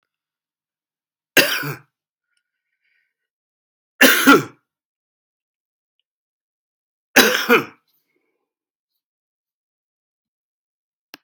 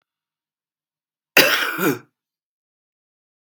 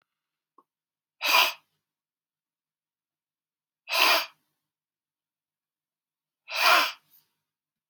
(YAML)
three_cough_length: 11.2 s
three_cough_amplitude: 32768
three_cough_signal_mean_std_ratio: 0.23
cough_length: 3.5 s
cough_amplitude: 32768
cough_signal_mean_std_ratio: 0.28
exhalation_length: 7.9 s
exhalation_amplitude: 17629
exhalation_signal_mean_std_ratio: 0.27
survey_phase: beta (2021-08-13 to 2022-03-07)
age: 45-64
gender: Male
wearing_mask: 'No'
symptom_cough_any: true
symptom_runny_or_blocked_nose: true
symptom_fatigue: true
symptom_fever_high_temperature: true
symptom_change_to_sense_of_smell_or_taste: true
symptom_loss_of_taste: true
symptom_onset: 5 days
smoker_status: Current smoker (e-cigarettes or vapes only)
respiratory_condition_asthma: false
respiratory_condition_other: false
recruitment_source: Test and Trace
submission_delay: 2 days
covid_test_result: Positive
covid_test_method: RT-qPCR
covid_ct_value: 26.3
covid_ct_gene: ORF1ab gene